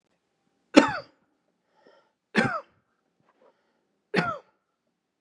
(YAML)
three_cough_length: 5.2 s
three_cough_amplitude: 32767
three_cough_signal_mean_std_ratio: 0.22
survey_phase: beta (2021-08-13 to 2022-03-07)
age: 65+
gender: Male
wearing_mask: 'No'
symptom_diarrhoea: true
smoker_status: Ex-smoker
respiratory_condition_asthma: false
respiratory_condition_other: false
recruitment_source: REACT
submission_delay: 1 day
covid_test_result: Negative
covid_test_method: RT-qPCR
influenza_a_test_result: Negative
influenza_b_test_result: Negative